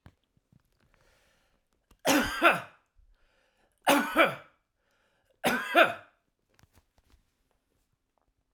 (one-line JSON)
{"three_cough_length": "8.5 s", "three_cough_amplitude": 15536, "three_cough_signal_mean_std_ratio": 0.3, "survey_phase": "alpha (2021-03-01 to 2021-08-12)", "age": "65+", "gender": "Male", "wearing_mask": "No", "symptom_none": true, "smoker_status": "Never smoked", "respiratory_condition_asthma": false, "respiratory_condition_other": false, "recruitment_source": "REACT", "submission_delay": "1 day", "covid_test_result": "Negative", "covid_test_method": "RT-qPCR"}